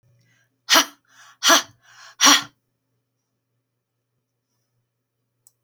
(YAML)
exhalation_length: 5.6 s
exhalation_amplitude: 30803
exhalation_signal_mean_std_ratio: 0.24
survey_phase: beta (2021-08-13 to 2022-03-07)
age: 65+
gender: Female
wearing_mask: 'No'
symptom_none: true
smoker_status: Never smoked
respiratory_condition_asthma: false
respiratory_condition_other: false
recruitment_source: REACT
submission_delay: 3 days
covid_test_result: Negative
covid_test_method: RT-qPCR